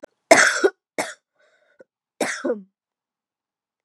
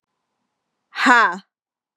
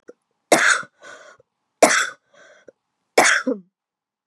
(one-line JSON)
{"cough_length": "3.8 s", "cough_amplitude": 32675, "cough_signal_mean_std_ratio": 0.29, "exhalation_length": "2.0 s", "exhalation_amplitude": 32744, "exhalation_signal_mean_std_ratio": 0.33, "three_cough_length": "4.3 s", "three_cough_amplitude": 32483, "three_cough_signal_mean_std_ratio": 0.35, "survey_phase": "beta (2021-08-13 to 2022-03-07)", "age": "18-44", "gender": "Female", "wearing_mask": "No", "symptom_cough_any": true, "symptom_runny_or_blocked_nose": true, "symptom_sore_throat": true, "symptom_fatigue": true, "symptom_headache": true, "symptom_onset": "3 days", "smoker_status": "Never smoked", "respiratory_condition_asthma": false, "respiratory_condition_other": false, "recruitment_source": "Test and Trace", "submission_delay": "1 day", "covid_test_result": "Positive", "covid_test_method": "RT-qPCR", "covid_ct_value": 20.0, "covid_ct_gene": "ORF1ab gene"}